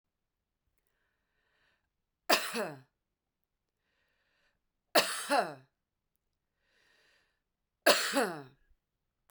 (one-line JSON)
{"three_cough_length": "9.3 s", "three_cough_amplitude": 13368, "three_cough_signal_mean_std_ratio": 0.26, "survey_phase": "beta (2021-08-13 to 2022-03-07)", "age": "45-64", "gender": "Female", "wearing_mask": "No", "symptom_runny_or_blocked_nose": true, "smoker_status": "Never smoked", "respiratory_condition_asthma": false, "respiratory_condition_other": false, "recruitment_source": "REACT", "submission_delay": "2 days", "covid_test_result": "Negative", "covid_test_method": "RT-qPCR", "influenza_a_test_result": "Negative", "influenza_b_test_result": "Negative"}